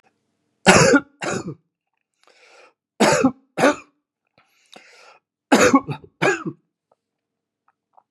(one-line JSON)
{"three_cough_length": "8.1 s", "three_cough_amplitude": 32768, "three_cough_signal_mean_std_ratio": 0.33, "survey_phase": "beta (2021-08-13 to 2022-03-07)", "age": "65+", "gender": "Male", "wearing_mask": "No", "symptom_cough_any": true, "symptom_runny_or_blocked_nose": true, "symptom_fatigue": true, "symptom_headache": true, "symptom_change_to_sense_of_smell_or_taste": true, "symptom_onset": "8 days", "smoker_status": "Ex-smoker", "respiratory_condition_asthma": false, "respiratory_condition_other": false, "recruitment_source": "Test and Trace", "submission_delay": "2 days", "covid_test_result": "Positive", "covid_test_method": "RT-qPCR", "covid_ct_value": 17.8, "covid_ct_gene": "ORF1ab gene", "covid_ct_mean": 19.0, "covid_viral_load": "600000 copies/ml", "covid_viral_load_category": "Low viral load (10K-1M copies/ml)"}